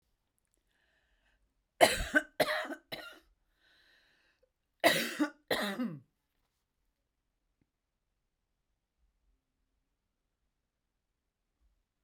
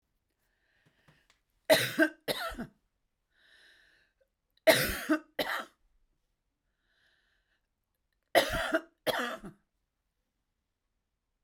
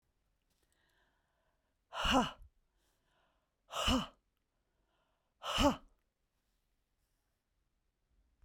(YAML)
cough_length: 12.0 s
cough_amplitude: 14185
cough_signal_mean_std_ratio: 0.24
three_cough_length: 11.4 s
three_cough_amplitude: 13879
three_cough_signal_mean_std_ratio: 0.29
exhalation_length: 8.4 s
exhalation_amplitude: 4592
exhalation_signal_mean_std_ratio: 0.26
survey_phase: beta (2021-08-13 to 2022-03-07)
age: 45-64
gender: Female
wearing_mask: 'No'
symptom_cough_any: true
symptom_onset: 4 days
smoker_status: Never smoked
respiratory_condition_asthma: false
respiratory_condition_other: false
recruitment_source: REACT
submission_delay: 4 days
covid_test_result: Negative
covid_test_method: RT-qPCR